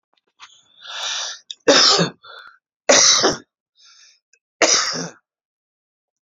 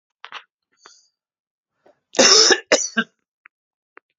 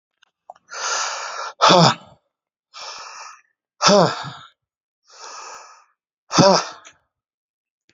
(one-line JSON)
{"three_cough_length": "6.2 s", "three_cough_amplitude": 31824, "three_cough_signal_mean_std_ratio": 0.4, "cough_length": "4.2 s", "cough_amplitude": 32274, "cough_signal_mean_std_ratio": 0.3, "exhalation_length": "7.9 s", "exhalation_amplitude": 32425, "exhalation_signal_mean_std_ratio": 0.34, "survey_phase": "alpha (2021-03-01 to 2021-08-12)", "age": "65+", "gender": "Male", "wearing_mask": "No", "symptom_none": true, "smoker_status": "Never smoked", "respiratory_condition_asthma": false, "respiratory_condition_other": false, "recruitment_source": "REACT", "submission_delay": "1 day", "covid_test_result": "Negative", "covid_test_method": "RT-qPCR"}